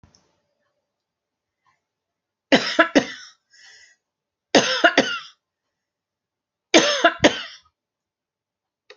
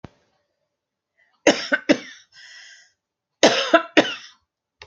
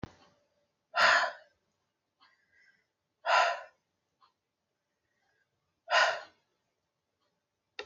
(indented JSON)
{
  "three_cough_length": "9.0 s",
  "three_cough_amplitude": 32768,
  "three_cough_signal_mean_std_ratio": 0.28,
  "cough_length": "4.9 s",
  "cough_amplitude": 30170,
  "cough_signal_mean_std_ratio": 0.29,
  "exhalation_length": "7.9 s",
  "exhalation_amplitude": 8585,
  "exhalation_signal_mean_std_ratio": 0.28,
  "survey_phase": "alpha (2021-03-01 to 2021-08-12)",
  "age": "45-64",
  "gender": "Female",
  "wearing_mask": "No",
  "symptom_none": true,
  "smoker_status": "Never smoked",
  "respiratory_condition_asthma": false,
  "respiratory_condition_other": false,
  "recruitment_source": "REACT",
  "submission_delay": "3 days",
  "covid_test_result": "Negative",
  "covid_test_method": "RT-qPCR"
}